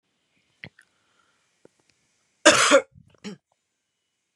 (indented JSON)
{
  "cough_length": "4.4 s",
  "cough_amplitude": 28568,
  "cough_signal_mean_std_ratio": 0.23,
  "survey_phase": "beta (2021-08-13 to 2022-03-07)",
  "age": "18-44",
  "gender": "Female",
  "wearing_mask": "No",
  "symptom_cough_any": true,
  "symptom_runny_or_blocked_nose": true,
  "symptom_sore_throat": true,
  "symptom_fatigue": true,
  "symptom_headache": true,
  "smoker_status": "Prefer not to say",
  "respiratory_condition_asthma": false,
  "respiratory_condition_other": false,
  "recruitment_source": "Test and Trace",
  "submission_delay": "2 days",
  "covid_test_result": "Positive",
  "covid_test_method": "RT-qPCR",
  "covid_ct_value": 29.3,
  "covid_ct_gene": "ORF1ab gene",
  "covid_ct_mean": 29.7,
  "covid_viral_load": "180 copies/ml",
  "covid_viral_load_category": "Minimal viral load (< 10K copies/ml)"
}